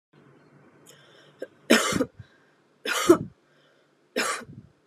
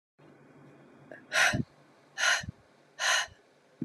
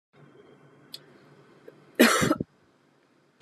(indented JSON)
{
  "three_cough_length": "4.9 s",
  "three_cough_amplitude": 22424,
  "three_cough_signal_mean_std_ratio": 0.31,
  "exhalation_length": "3.8 s",
  "exhalation_amplitude": 8824,
  "exhalation_signal_mean_std_ratio": 0.41,
  "cough_length": "3.4 s",
  "cough_amplitude": 19753,
  "cough_signal_mean_std_ratio": 0.27,
  "survey_phase": "beta (2021-08-13 to 2022-03-07)",
  "age": "18-44",
  "gender": "Female",
  "wearing_mask": "No",
  "symptom_runny_or_blocked_nose": true,
  "symptom_sore_throat": true,
  "symptom_fatigue": true,
  "symptom_fever_high_temperature": true,
  "symptom_headache": true,
  "symptom_onset": "2 days",
  "smoker_status": "Ex-smoker",
  "respiratory_condition_asthma": false,
  "respiratory_condition_other": false,
  "recruitment_source": "Test and Trace",
  "submission_delay": "1 day",
  "covid_test_result": "Positive",
  "covid_test_method": "ePCR"
}